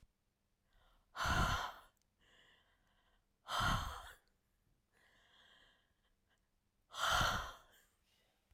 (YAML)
exhalation_length: 8.5 s
exhalation_amplitude: 2445
exhalation_signal_mean_std_ratio: 0.36
survey_phase: alpha (2021-03-01 to 2021-08-12)
age: 45-64
gender: Female
wearing_mask: 'No'
symptom_none: true
symptom_fatigue: true
smoker_status: Ex-smoker
respiratory_condition_asthma: false
respiratory_condition_other: false
recruitment_source: REACT
submission_delay: 5 days
covid_test_result: Negative
covid_test_method: RT-qPCR